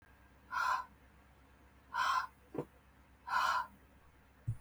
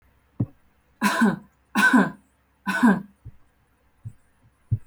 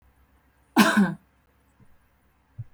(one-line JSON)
{"exhalation_length": "4.6 s", "exhalation_amplitude": 3122, "exhalation_signal_mean_std_ratio": 0.47, "three_cough_length": "4.9 s", "three_cough_amplitude": 18800, "three_cough_signal_mean_std_ratio": 0.4, "cough_length": "2.7 s", "cough_amplitude": 22076, "cough_signal_mean_std_ratio": 0.3, "survey_phase": "beta (2021-08-13 to 2022-03-07)", "age": "18-44", "gender": "Female", "wearing_mask": "No", "symptom_sore_throat": true, "symptom_diarrhoea": true, "symptom_headache": true, "smoker_status": "Never smoked", "respiratory_condition_asthma": false, "respiratory_condition_other": false, "recruitment_source": "Test and Trace", "submission_delay": "2 days", "covid_test_result": "Positive", "covid_test_method": "RT-qPCR", "covid_ct_value": 32.2, "covid_ct_gene": "N gene"}